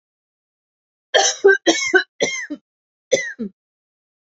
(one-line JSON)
{"cough_length": "4.3 s", "cough_amplitude": 28203, "cough_signal_mean_std_ratio": 0.37, "survey_phase": "alpha (2021-03-01 to 2021-08-12)", "age": "45-64", "gender": "Female", "wearing_mask": "No", "symptom_fatigue": true, "symptom_onset": "12 days", "smoker_status": "Never smoked", "respiratory_condition_asthma": false, "respiratory_condition_other": false, "recruitment_source": "REACT", "submission_delay": "0 days", "covid_test_result": "Negative", "covid_test_method": "RT-qPCR"}